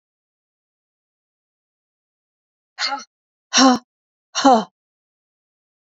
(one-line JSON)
{"exhalation_length": "5.9 s", "exhalation_amplitude": 30071, "exhalation_signal_mean_std_ratio": 0.24, "survey_phase": "beta (2021-08-13 to 2022-03-07)", "age": "18-44", "gender": "Female", "wearing_mask": "No", "symptom_runny_or_blocked_nose": true, "symptom_onset": "12 days", "smoker_status": "Never smoked", "respiratory_condition_asthma": false, "respiratory_condition_other": false, "recruitment_source": "REACT", "submission_delay": "1 day", "covid_test_result": "Negative", "covid_test_method": "RT-qPCR", "influenza_a_test_result": "Unknown/Void", "influenza_b_test_result": "Unknown/Void"}